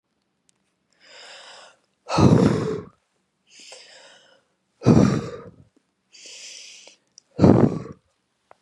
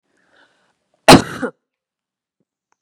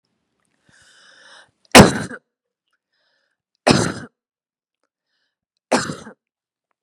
{
  "exhalation_length": "8.6 s",
  "exhalation_amplitude": 31561,
  "exhalation_signal_mean_std_ratio": 0.32,
  "cough_length": "2.8 s",
  "cough_amplitude": 32768,
  "cough_signal_mean_std_ratio": 0.2,
  "three_cough_length": "6.8 s",
  "three_cough_amplitude": 32768,
  "three_cough_signal_mean_std_ratio": 0.21,
  "survey_phase": "beta (2021-08-13 to 2022-03-07)",
  "age": "45-64",
  "gender": "Female",
  "wearing_mask": "No",
  "symptom_none": true,
  "smoker_status": "Ex-smoker",
  "respiratory_condition_asthma": false,
  "respiratory_condition_other": false,
  "recruitment_source": "Test and Trace",
  "submission_delay": "1 day",
  "covid_test_result": "Negative",
  "covid_test_method": "RT-qPCR"
}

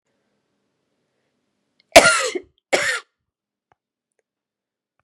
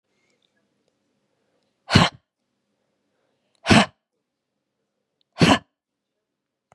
{
  "cough_length": "5.0 s",
  "cough_amplitude": 32768,
  "cough_signal_mean_std_ratio": 0.22,
  "exhalation_length": "6.7 s",
  "exhalation_amplitude": 31915,
  "exhalation_signal_mean_std_ratio": 0.21,
  "survey_phase": "beta (2021-08-13 to 2022-03-07)",
  "age": "45-64",
  "gender": "Female",
  "wearing_mask": "No",
  "symptom_cough_any": true,
  "symptom_runny_or_blocked_nose": true,
  "symptom_sore_throat": true,
  "symptom_onset": "3 days",
  "smoker_status": "Never smoked",
  "respiratory_condition_asthma": false,
  "respiratory_condition_other": false,
  "recruitment_source": "Test and Trace",
  "submission_delay": "2 days",
  "covid_test_result": "Positive",
  "covid_test_method": "RT-qPCR",
  "covid_ct_value": 12.1,
  "covid_ct_gene": "ORF1ab gene",
  "covid_ct_mean": 12.5,
  "covid_viral_load": "79000000 copies/ml",
  "covid_viral_load_category": "High viral load (>1M copies/ml)"
}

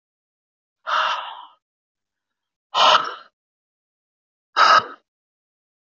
{
  "exhalation_length": "6.0 s",
  "exhalation_amplitude": 24651,
  "exhalation_signal_mean_std_ratio": 0.31,
  "survey_phase": "beta (2021-08-13 to 2022-03-07)",
  "age": "45-64",
  "gender": "Female",
  "wearing_mask": "No",
  "symptom_cough_any": true,
  "symptom_runny_or_blocked_nose": true,
  "symptom_sore_throat": true,
  "symptom_fatigue": true,
  "symptom_fever_high_temperature": true,
  "symptom_headache": true,
  "symptom_change_to_sense_of_smell_or_taste": true,
  "symptom_onset": "4 days",
  "smoker_status": "Never smoked",
  "respiratory_condition_asthma": false,
  "respiratory_condition_other": false,
  "recruitment_source": "Test and Trace",
  "submission_delay": "2 days",
  "covid_test_result": "Positive",
  "covid_test_method": "ePCR"
}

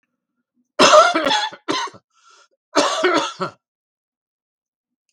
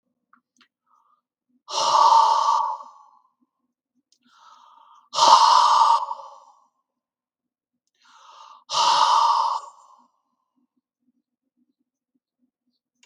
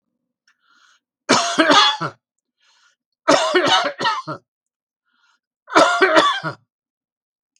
{
  "cough_length": "5.1 s",
  "cough_amplitude": 32768,
  "cough_signal_mean_std_ratio": 0.39,
  "exhalation_length": "13.1 s",
  "exhalation_amplitude": 32210,
  "exhalation_signal_mean_std_ratio": 0.38,
  "three_cough_length": "7.6 s",
  "three_cough_amplitude": 32768,
  "three_cough_signal_mean_std_ratio": 0.43,
  "survey_phase": "alpha (2021-03-01 to 2021-08-12)",
  "age": "65+",
  "gender": "Male",
  "wearing_mask": "No",
  "symptom_cough_any": true,
  "smoker_status": "Ex-smoker",
  "respiratory_condition_asthma": false,
  "respiratory_condition_other": false,
  "recruitment_source": "REACT",
  "submission_delay": "1 day",
  "covid_test_result": "Negative",
  "covid_test_method": "RT-qPCR"
}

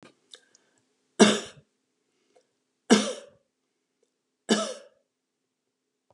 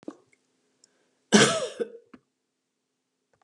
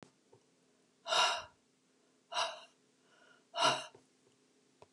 {
  "three_cough_length": "6.1 s",
  "three_cough_amplitude": 23352,
  "three_cough_signal_mean_std_ratio": 0.22,
  "cough_length": "3.4 s",
  "cough_amplitude": 21919,
  "cough_signal_mean_std_ratio": 0.25,
  "exhalation_length": "4.9 s",
  "exhalation_amplitude": 5757,
  "exhalation_signal_mean_std_ratio": 0.33,
  "survey_phase": "beta (2021-08-13 to 2022-03-07)",
  "age": "65+",
  "gender": "Female",
  "wearing_mask": "No",
  "symptom_other": true,
  "symptom_onset": "2 days",
  "smoker_status": "Never smoked",
  "respiratory_condition_asthma": false,
  "respiratory_condition_other": false,
  "recruitment_source": "REACT",
  "submission_delay": "0 days",
  "covid_test_result": "Negative",
  "covid_test_method": "RT-qPCR",
  "influenza_a_test_result": "Unknown/Void",
  "influenza_b_test_result": "Unknown/Void"
}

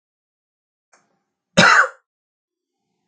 {
  "cough_length": "3.1 s",
  "cough_amplitude": 32768,
  "cough_signal_mean_std_ratio": 0.25,
  "survey_phase": "beta (2021-08-13 to 2022-03-07)",
  "age": "45-64",
  "gender": "Male",
  "wearing_mask": "No",
  "symptom_none": true,
  "smoker_status": "Never smoked",
  "respiratory_condition_asthma": false,
  "respiratory_condition_other": false,
  "recruitment_source": "REACT",
  "submission_delay": "1 day",
  "covid_test_result": "Negative",
  "covid_test_method": "RT-qPCR",
  "influenza_a_test_result": "Negative",
  "influenza_b_test_result": "Negative"
}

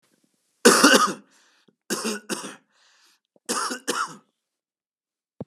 {
  "three_cough_length": "5.5 s",
  "three_cough_amplitude": 30348,
  "three_cough_signal_mean_std_ratio": 0.33,
  "survey_phase": "beta (2021-08-13 to 2022-03-07)",
  "age": "45-64",
  "gender": "Male",
  "wearing_mask": "Yes",
  "symptom_cough_any": true,
  "symptom_runny_or_blocked_nose": true,
  "symptom_onset": "3 days",
  "smoker_status": "Ex-smoker",
  "respiratory_condition_asthma": false,
  "respiratory_condition_other": false,
  "recruitment_source": "Test and Trace",
  "submission_delay": "2 days",
  "covid_test_result": "Positive",
  "covid_test_method": "RT-qPCR",
  "covid_ct_value": 22.2,
  "covid_ct_gene": "ORF1ab gene"
}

